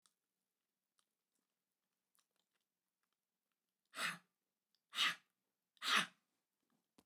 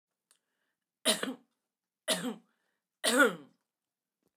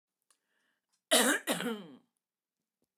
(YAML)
exhalation_length: 7.1 s
exhalation_amplitude: 3715
exhalation_signal_mean_std_ratio: 0.22
three_cough_length: 4.4 s
three_cough_amplitude: 8854
three_cough_signal_mean_std_ratio: 0.3
cough_length: 3.0 s
cough_amplitude: 8139
cough_signal_mean_std_ratio: 0.33
survey_phase: beta (2021-08-13 to 2022-03-07)
age: 45-64
gender: Female
wearing_mask: 'No'
symptom_cough_any: true
smoker_status: Current smoker (11 or more cigarettes per day)
respiratory_condition_asthma: false
respiratory_condition_other: false
recruitment_source: REACT
submission_delay: 1 day
covid_test_result: Negative
covid_test_method: RT-qPCR